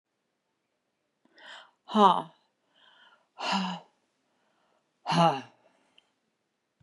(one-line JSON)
{"exhalation_length": "6.8 s", "exhalation_amplitude": 16296, "exhalation_signal_mean_std_ratio": 0.26, "survey_phase": "beta (2021-08-13 to 2022-03-07)", "age": "65+", "gender": "Female", "wearing_mask": "Yes", "symptom_sore_throat": true, "symptom_onset": "12 days", "smoker_status": "Ex-smoker", "respiratory_condition_asthma": false, "respiratory_condition_other": false, "recruitment_source": "REACT", "submission_delay": "2 days", "covid_test_result": "Negative", "covid_test_method": "RT-qPCR", "influenza_a_test_result": "Negative", "influenza_b_test_result": "Negative"}